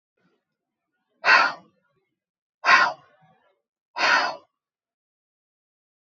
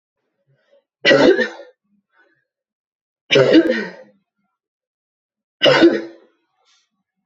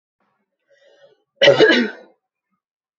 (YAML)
exhalation_length: 6.1 s
exhalation_amplitude: 23990
exhalation_signal_mean_std_ratio: 0.3
three_cough_length: 7.3 s
three_cough_amplitude: 32767
three_cough_signal_mean_std_ratio: 0.34
cough_length: 3.0 s
cough_amplitude: 28355
cough_signal_mean_std_ratio: 0.32
survey_phase: beta (2021-08-13 to 2022-03-07)
age: 18-44
gender: Female
wearing_mask: 'No'
symptom_runny_or_blocked_nose: true
symptom_change_to_sense_of_smell_or_taste: true
symptom_onset: 3 days
smoker_status: Never smoked
respiratory_condition_asthma: false
respiratory_condition_other: false
recruitment_source: Test and Trace
submission_delay: 2 days
covid_test_result: Positive
covid_test_method: RT-qPCR